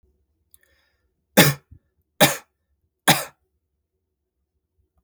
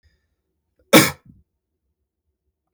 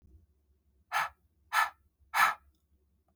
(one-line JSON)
{"three_cough_length": "5.0 s", "three_cough_amplitude": 32469, "three_cough_signal_mean_std_ratio": 0.22, "cough_length": "2.7 s", "cough_amplitude": 32766, "cough_signal_mean_std_ratio": 0.19, "exhalation_length": "3.2 s", "exhalation_amplitude": 9086, "exhalation_signal_mean_std_ratio": 0.32, "survey_phase": "beta (2021-08-13 to 2022-03-07)", "age": "45-64", "gender": "Male", "wearing_mask": "No", "symptom_none": true, "smoker_status": "Ex-smoker", "respiratory_condition_asthma": false, "respiratory_condition_other": false, "recruitment_source": "REACT", "submission_delay": "2 days", "covid_test_result": "Negative", "covid_test_method": "RT-qPCR", "influenza_a_test_result": "Unknown/Void", "influenza_b_test_result": "Unknown/Void"}